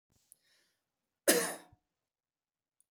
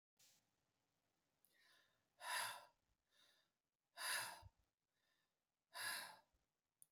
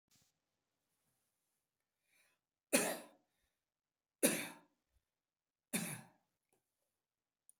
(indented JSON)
{
  "cough_length": "2.9 s",
  "cough_amplitude": 8878,
  "cough_signal_mean_std_ratio": 0.22,
  "exhalation_length": "6.9 s",
  "exhalation_amplitude": 872,
  "exhalation_signal_mean_std_ratio": 0.34,
  "three_cough_length": "7.6 s",
  "three_cough_amplitude": 4954,
  "three_cough_signal_mean_std_ratio": 0.22,
  "survey_phase": "beta (2021-08-13 to 2022-03-07)",
  "age": "65+",
  "gender": "Male",
  "wearing_mask": "No",
  "symptom_none": true,
  "smoker_status": "Never smoked",
  "respiratory_condition_asthma": false,
  "respiratory_condition_other": false,
  "recruitment_source": "REACT",
  "submission_delay": "5 days",
  "covid_test_result": "Negative",
  "covid_test_method": "RT-qPCR",
  "influenza_a_test_result": "Negative",
  "influenza_b_test_result": "Negative"
}